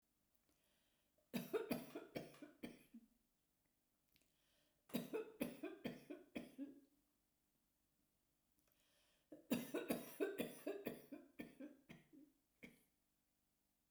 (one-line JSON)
{"three_cough_length": "13.9 s", "three_cough_amplitude": 1372, "three_cough_signal_mean_std_ratio": 0.39, "survey_phase": "beta (2021-08-13 to 2022-03-07)", "age": "65+", "gender": "Female", "wearing_mask": "No", "symptom_none": true, "smoker_status": "Ex-smoker", "respiratory_condition_asthma": false, "respiratory_condition_other": false, "recruitment_source": "REACT", "submission_delay": "1 day", "covid_test_result": "Negative", "covid_test_method": "RT-qPCR"}